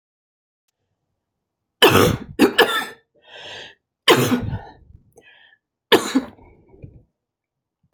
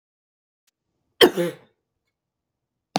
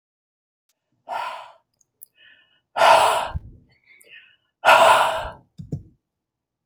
{"three_cough_length": "7.9 s", "three_cough_amplitude": 32768, "three_cough_signal_mean_std_ratio": 0.33, "cough_length": "3.0 s", "cough_amplitude": 28802, "cough_signal_mean_std_ratio": 0.2, "exhalation_length": "6.7 s", "exhalation_amplitude": 28027, "exhalation_signal_mean_std_ratio": 0.35, "survey_phase": "beta (2021-08-13 to 2022-03-07)", "age": "45-64", "gender": "Female", "wearing_mask": "No", "symptom_none": true, "smoker_status": "Never smoked", "respiratory_condition_asthma": false, "respiratory_condition_other": false, "recruitment_source": "REACT", "submission_delay": "1 day", "covid_test_result": "Negative", "covid_test_method": "RT-qPCR", "influenza_a_test_result": "Negative", "influenza_b_test_result": "Negative"}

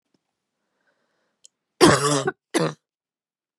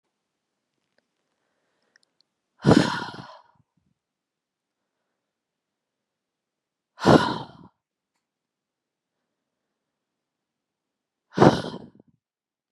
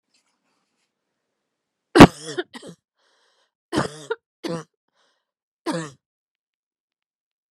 {"cough_length": "3.6 s", "cough_amplitude": 29611, "cough_signal_mean_std_ratio": 0.3, "exhalation_length": "12.7 s", "exhalation_amplitude": 31776, "exhalation_signal_mean_std_ratio": 0.19, "three_cough_length": "7.5 s", "three_cough_amplitude": 32768, "three_cough_signal_mean_std_ratio": 0.16, "survey_phase": "beta (2021-08-13 to 2022-03-07)", "age": "18-44", "gender": "Female", "wearing_mask": "No", "symptom_cough_any": true, "symptom_runny_or_blocked_nose": true, "symptom_fatigue": true, "symptom_headache": true, "symptom_onset": "8 days", "smoker_status": "Never smoked", "respiratory_condition_asthma": false, "respiratory_condition_other": false, "recruitment_source": "Test and Trace", "submission_delay": "1 day", "covid_test_result": "Positive", "covid_test_method": "RT-qPCR", "covid_ct_value": 20.5, "covid_ct_gene": "ORF1ab gene"}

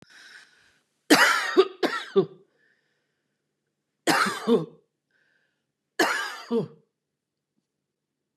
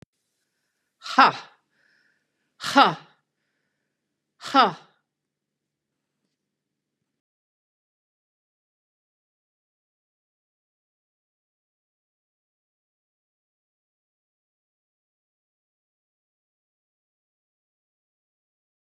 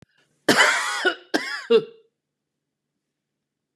{"three_cough_length": "8.4 s", "three_cough_amplitude": 23197, "three_cough_signal_mean_std_ratio": 0.35, "exhalation_length": "18.9 s", "exhalation_amplitude": 30909, "exhalation_signal_mean_std_ratio": 0.13, "cough_length": "3.8 s", "cough_amplitude": 26643, "cough_signal_mean_std_ratio": 0.38, "survey_phase": "beta (2021-08-13 to 2022-03-07)", "age": "65+", "gender": "Female", "wearing_mask": "No", "symptom_runny_or_blocked_nose": true, "symptom_onset": "11 days", "smoker_status": "Current smoker (e-cigarettes or vapes only)", "respiratory_condition_asthma": false, "respiratory_condition_other": false, "recruitment_source": "REACT", "submission_delay": "2 days", "covid_test_result": "Negative", "covid_test_method": "RT-qPCR", "influenza_a_test_result": "Negative", "influenza_b_test_result": "Negative"}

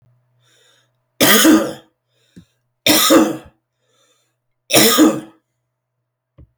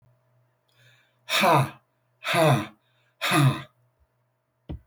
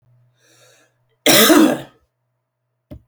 {"three_cough_length": "6.6 s", "three_cough_amplitude": 32768, "three_cough_signal_mean_std_ratio": 0.39, "exhalation_length": "4.9 s", "exhalation_amplitude": 12895, "exhalation_signal_mean_std_ratio": 0.41, "cough_length": "3.1 s", "cough_amplitude": 32768, "cough_signal_mean_std_ratio": 0.35, "survey_phase": "beta (2021-08-13 to 2022-03-07)", "age": "45-64", "gender": "Male", "wearing_mask": "No", "symptom_cough_any": true, "symptom_runny_or_blocked_nose": true, "symptom_fatigue": true, "symptom_onset": "2 days", "smoker_status": "Never smoked", "respiratory_condition_asthma": false, "respiratory_condition_other": false, "recruitment_source": "Test and Trace", "submission_delay": "1 day", "covid_test_result": "Positive", "covid_test_method": "ePCR"}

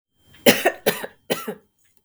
{"three_cough_length": "2.0 s", "three_cough_amplitude": 32768, "three_cough_signal_mean_std_ratio": 0.34, "survey_phase": "beta (2021-08-13 to 2022-03-07)", "age": "45-64", "gender": "Female", "wearing_mask": "No", "symptom_sore_throat": true, "symptom_onset": "3 days", "smoker_status": "Never smoked", "respiratory_condition_asthma": false, "respiratory_condition_other": false, "recruitment_source": "REACT", "submission_delay": "2 days", "covid_test_result": "Negative", "covid_test_method": "RT-qPCR", "influenza_a_test_result": "Negative", "influenza_b_test_result": "Negative"}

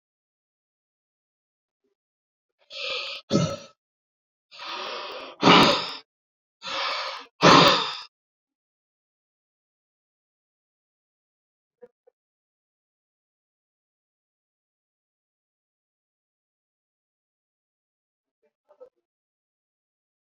{"exhalation_length": "20.4 s", "exhalation_amplitude": 26631, "exhalation_signal_mean_std_ratio": 0.22, "survey_phase": "beta (2021-08-13 to 2022-03-07)", "age": "45-64", "gender": "Male", "wearing_mask": "No", "symptom_none": true, "smoker_status": "Ex-smoker", "respiratory_condition_asthma": false, "respiratory_condition_other": false, "recruitment_source": "REACT", "submission_delay": "5 days", "covid_test_result": "Negative", "covid_test_method": "RT-qPCR"}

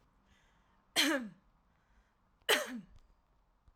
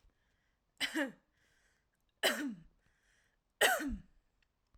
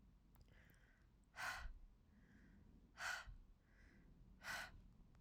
{"cough_length": "3.8 s", "cough_amplitude": 5738, "cough_signal_mean_std_ratio": 0.31, "three_cough_length": "4.8 s", "three_cough_amplitude": 6120, "three_cough_signal_mean_std_ratio": 0.33, "exhalation_length": "5.2 s", "exhalation_amplitude": 593, "exhalation_signal_mean_std_ratio": 0.57, "survey_phase": "alpha (2021-03-01 to 2021-08-12)", "age": "18-44", "gender": "Female", "wearing_mask": "No", "symptom_none": true, "smoker_status": "Never smoked", "respiratory_condition_asthma": false, "respiratory_condition_other": false, "recruitment_source": "REACT", "submission_delay": "1 day", "covid_test_result": "Negative", "covid_test_method": "RT-qPCR"}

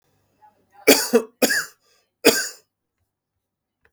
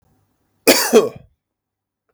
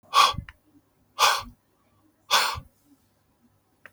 {"three_cough_length": "3.9 s", "three_cough_amplitude": 32768, "three_cough_signal_mean_std_ratio": 0.3, "cough_length": "2.1 s", "cough_amplitude": 32768, "cough_signal_mean_std_ratio": 0.32, "exhalation_length": "3.9 s", "exhalation_amplitude": 18247, "exhalation_signal_mean_std_ratio": 0.33, "survey_phase": "beta (2021-08-13 to 2022-03-07)", "age": "18-44", "gender": "Male", "wearing_mask": "No", "symptom_none": true, "smoker_status": "Never smoked", "respiratory_condition_asthma": false, "respiratory_condition_other": false, "recruitment_source": "REACT", "submission_delay": "3 days", "covid_test_result": "Negative", "covid_test_method": "RT-qPCR", "influenza_a_test_result": "Negative", "influenza_b_test_result": "Negative"}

